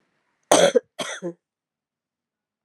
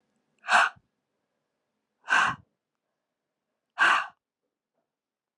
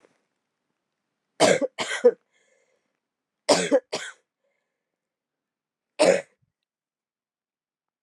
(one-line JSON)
{"cough_length": "2.6 s", "cough_amplitude": 32767, "cough_signal_mean_std_ratio": 0.28, "exhalation_length": "5.4 s", "exhalation_amplitude": 14260, "exhalation_signal_mean_std_ratio": 0.29, "three_cough_length": "8.0 s", "three_cough_amplitude": 22401, "three_cough_signal_mean_std_ratio": 0.26, "survey_phase": "alpha (2021-03-01 to 2021-08-12)", "age": "45-64", "gender": "Female", "wearing_mask": "No", "symptom_cough_any": true, "symptom_shortness_of_breath": true, "symptom_fatigue": true, "symptom_headache": true, "smoker_status": "Never smoked", "respiratory_condition_asthma": false, "respiratory_condition_other": false, "recruitment_source": "Test and Trace", "submission_delay": "1 day", "covid_test_result": "Positive", "covid_test_method": "RT-qPCR", "covid_ct_value": 14.8, "covid_ct_gene": "ORF1ab gene", "covid_ct_mean": 15.1, "covid_viral_load": "11000000 copies/ml", "covid_viral_load_category": "High viral load (>1M copies/ml)"}